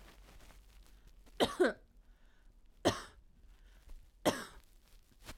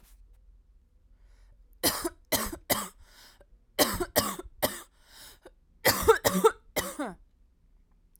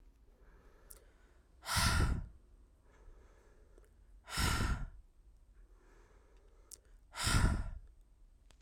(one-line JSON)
{"three_cough_length": "5.4 s", "three_cough_amplitude": 5562, "three_cough_signal_mean_std_ratio": 0.31, "cough_length": "8.2 s", "cough_amplitude": 15444, "cough_signal_mean_std_ratio": 0.36, "exhalation_length": "8.6 s", "exhalation_amplitude": 4139, "exhalation_signal_mean_std_ratio": 0.41, "survey_phase": "alpha (2021-03-01 to 2021-08-12)", "age": "18-44", "gender": "Female", "wearing_mask": "No", "symptom_cough_any": true, "symptom_abdominal_pain": true, "symptom_diarrhoea": true, "symptom_fatigue": true, "symptom_headache": true, "symptom_onset": "4 days", "smoker_status": "Never smoked", "respiratory_condition_asthma": false, "respiratory_condition_other": false, "recruitment_source": "Test and Trace", "submission_delay": "2 days", "covid_test_result": "Positive", "covid_test_method": "RT-qPCR", "covid_ct_value": 17.3, "covid_ct_gene": "ORF1ab gene", "covid_ct_mean": 17.8, "covid_viral_load": "1500000 copies/ml", "covid_viral_load_category": "High viral load (>1M copies/ml)"}